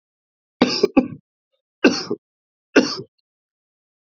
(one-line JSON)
{"three_cough_length": "4.0 s", "three_cough_amplitude": 27607, "three_cough_signal_mean_std_ratio": 0.29, "survey_phase": "beta (2021-08-13 to 2022-03-07)", "age": "45-64", "gender": "Male", "wearing_mask": "No", "symptom_cough_any": true, "symptom_runny_or_blocked_nose": true, "smoker_status": "Never smoked", "respiratory_condition_asthma": false, "respiratory_condition_other": false, "recruitment_source": "Test and Trace", "submission_delay": "2 days", "covid_test_result": "Positive", "covid_test_method": "RT-qPCR", "covid_ct_value": 33.4, "covid_ct_gene": "ORF1ab gene"}